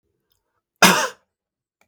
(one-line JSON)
{"cough_length": "1.9 s", "cough_amplitude": 32768, "cough_signal_mean_std_ratio": 0.26, "survey_phase": "beta (2021-08-13 to 2022-03-07)", "age": "65+", "gender": "Male", "wearing_mask": "No", "symptom_none": true, "smoker_status": "Ex-smoker", "respiratory_condition_asthma": false, "respiratory_condition_other": false, "recruitment_source": "REACT", "submission_delay": "2 days", "covid_test_result": "Negative", "covid_test_method": "RT-qPCR", "influenza_a_test_result": "Negative", "influenza_b_test_result": "Negative"}